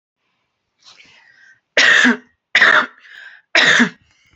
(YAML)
three_cough_length: 4.4 s
three_cough_amplitude: 31848
three_cough_signal_mean_std_ratio: 0.42
survey_phase: alpha (2021-03-01 to 2021-08-12)
age: 45-64
gender: Female
wearing_mask: 'No'
symptom_change_to_sense_of_smell_or_taste: true
symptom_onset: 8 days
smoker_status: Ex-smoker
respiratory_condition_asthma: false
respiratory_condition_other: false
recruitment_source: REACT
submission_delay: 1 day
covid_test_result: Negative
covid_test_method: RT-qPCR